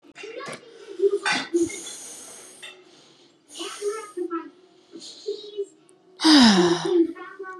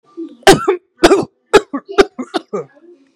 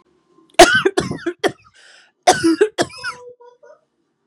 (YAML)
exhalation_length: 7.6 s
exhalation_amplitude: 26964
exhalation_signal_mean_std_ratio: 0.46
three_cough_length: 3.2 s
three_cough_amplitude: 32768
three_cough_signal_mean_std_ratio: 0.39
cough_length: 4.3 s
cough_amplitude: 32768
cough_signal_mean_std_ratio: 0.36
survey_phase: beta (2021-08-13 to 2022-03-07)
age: 18-44
gender: Female
wearing_mask: 'No'
symptom_none: true
smoker_status: Ex-smoker
respiratory_condition_asthma: false
respiratory_condition_other: false
recruitment_source: REACT
submission_delay: 2 days
covid_test_result: Negative
covid_test_method: RT-qPCR
influenza_a_test_result: Negative
influenza_b_test_result: Negative